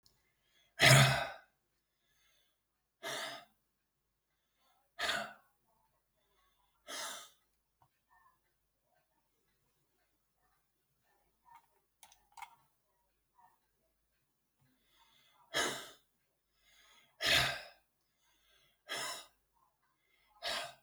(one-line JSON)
{"exhalation_length": "20.8 s", "exhalation_amplitude": 10173, "exhalation_signal_mean_std_ratio": 0.22, "survey_phase": "alpha (2021-03-01 to 2021-08-12)", "age": "65+", "gender": "Male", "wearing_mask": "No", "symptom_none": true, "smoker_status": "Never smoked", "respiratory_condition_asthma": false, "respiratory_condition_other": false, "recruitment_source": "REACT", "submission_delay": "6 days", "covid_test_result": "Negative", "covid_test_method": "RT-qPCR"}